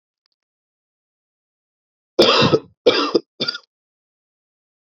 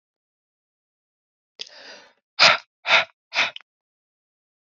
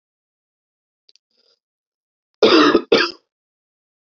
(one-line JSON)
{"three_cough_length": "4.9 s", "three_cough_amplitude": 31688, "three_cough_signal_mean_std_ratio": 0.3, "exhalation_length": "4.7 s", "exhalation_amplitude": 32767, "exhalation_signal_mean_std_ratio": 0.24, "cough_length": "4.1 s", "cough_amplitude": 28317, "cough_signal_mean_std_ratio": 0.29, "survey_phase": "alpha (2021-03-01 to 2021-08-12)", "age": "18-44", "gender": "Male", "wearing_mask": "No", "symptom_fatigue": true, "symptom_change_to_sense_of_smell_or_taste": true, "symptom_loss_of_taste": true, "symptom_onset": "3 days", "smoker_status": "Ex-smoker", "respiratory_condition_asthma": false, "respiratory_condition_other": false, "recruitment_source": "Test and Trace", "submission_delay": "1 day", "covid_test_result": "Positive", "covid_test_method": "RT-qPCR"}